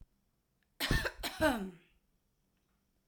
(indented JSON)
{
  "cough_length": "3.1 s",
  "cough_amplitude": 4677,
  "cough_signal_mean_std_ratio": 0.37,
  "survey_phase": "alpha (2021-03-01 to 2021-08-12)",
  "age": "45-64",
  "gender": "Female",
  "wearing_mask": "No",
  "symptom_none": true,
  "smoker_status": "Ex-smoker",
  "respiratory_condition_asthma": false,
  "respiratory_condition_other": false,
  "recruitment_source": "REACT",
  "submission_delay": "2 days",
  "covid_test_result": "Negative",
  "covid_test_method": "RT-qPCR"
}